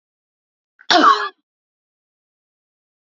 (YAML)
cough_length: 3.2 s
cough_amplitude: 29396
cough_signal_mean_std_ratio: 0.26
survey_phase: beta (2021-08-13 to 2022-03-07)
age: 45-64
gender: Female
wearing_mask: 'No'
symptom_sore_throat: true
smoker_status: Never smoked
respiratory_condition_asthma: false
respiratory_condition_other: false
recruitment_source: Test and Trace
submission_delay: 2 days
covid_test_result: Positive
covid_test_method: RT-qPCR
covid_ct_value: 30.3
covid_ct_gene: ORF1ab gene